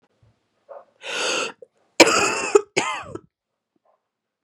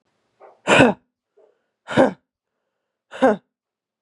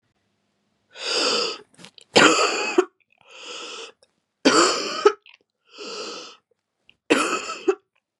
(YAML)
cough_length: 4.4 s
cough_amplitude: 32768
cough_signal_mean_std_ratio: 0.34
exhalation_length: 4.0 s
exhalation_amplitude: 32765
exhalation_signal_mean_std_ratio: 0.29
three_cough_length: 8.2 s
three_cough_amplitude: 32052
three_cough_signal_mean_std_ratio: 0.41
survey_phase: beta (2021-08-13 to 2022-03-07)
age: 18-44
gender: Female
wearing_mask: 'No'
symptom_cough_any: true
symptom_runny_or_blocked_nose: true
symptom_fatigue: true
symptom_other: true
symptom_onset: 3 days
smoker_status: Never smoked
respiratory_condition_asthma: false
respiratory_condition_other: false
recruitment_source: Test and Trace
submission_delay: 1 day
covid_test_result: Positive
covid_test_method: RT-qPCR
covid_ct_value: 17.3
covid_ct_gene: N gene
covid_ct_mean: 17.5
covid_viral_load: 1800000 copies/ml
covid_viral_load_category: High viral load (>1M copies/ml)